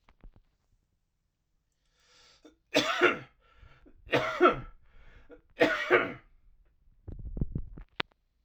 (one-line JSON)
{"three_cough_length": "8.4 s", "three_cough_amplitude": 13909, "three_cough_signal_mean_std_ratio": 0.34, "survey_phase": "alpha (2021-03-01 to 2021-08-12)", "age": "18-44", "gender": "Male", "wearing_mask": "No", "symptom_cough_any": true, "symptom_shortness_of_breath": true, "symptom_onset": "8 days", "smoker_status": "Ex-smoker", "respiratory_condition_asthma": true, "respiratory_condition_other": false, "recruitment_source": "Test and Trace", "submission_delay": "1 day", "covid_test_result": "Positive", "covid_test_method": "RT-qPCR", "covid_ct_value": 17.2, "covid_ct_gene": "ORF1ab gene", "covid_ct_mean": 17.3, "covid_viral_load": "2100000 copies/ml", "covid_viral_load_category": "High viral load (>1M copies/ml)"}